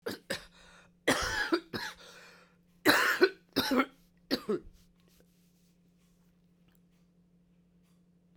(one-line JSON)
{"cough_length": "8.4 s", "cough_amplitude": 14292, "cough_signal_mean_std_ratio": 0.35, "survey_phase": "beta (2021-08-13 to 2022-03-07)", "age": "45-64", "gender": "Female", "wearing_mask": "No", "symptom_cough_any": true, "symptom_sore_throat": true, "symptom_headache": true, "symptom_onset": "4 days", "smoker_status": "Never smoked", "respiratory_condition_asthma": false, "respiratory_condition_other": false, "recruitment_source": "Test and Trace", "submission_delay": "1 day", "covid_test_result": "Positive", "covid_test_method": "RT-qPCR"}